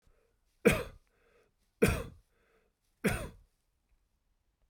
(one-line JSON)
{"three_cough_length": "4.7 s", "three_cough_amplitude": 9752, "three_cough_signal_mean_std_ratio": 0.26, "survey_phase": "beta (2021-08-13 to 2022-03-07)", "age": "45-64", "gender": "Male", "wearing_mask": "No", "symptom_none": true, "smoker_status": "Ex-smoker", "respiratory_condition_asthma": false, "respiratory_condition_other": false, "recruitment_source": "REACT", "submission_delay": "2 days", "covid_test_result": "Negative", "covid_test_method": "RT-qPCR"}